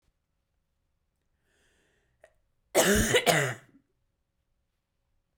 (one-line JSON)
{"cough_length": "5.4 s", "cough_amplitude": 13472, "cough_signal_mean_std_ratio": 0.29, "survey_phase": "beta (2021-08-13 to 2022-03-07)", "age": "18-44", "gender": "Female", "wearing_mask": "No", "symptom_cough_any": true, "symptom_new_continuous_cough": true, "symptom_runny_or_blocked_nose": true, "symptom_sore_throat": true, "symptom_fatigue": true, "symptom_headache": true, "symptom_onset": "2 days", "smoker_status": "Never smoked", "recruitment_source": "Test and Trace", "submission_delay": "1 day", "covid_test_result": "Positive", "covid_test_method": "RT-qPCR", "covid_ct_value": 31.1, "covid_ct_gene": "N gene"}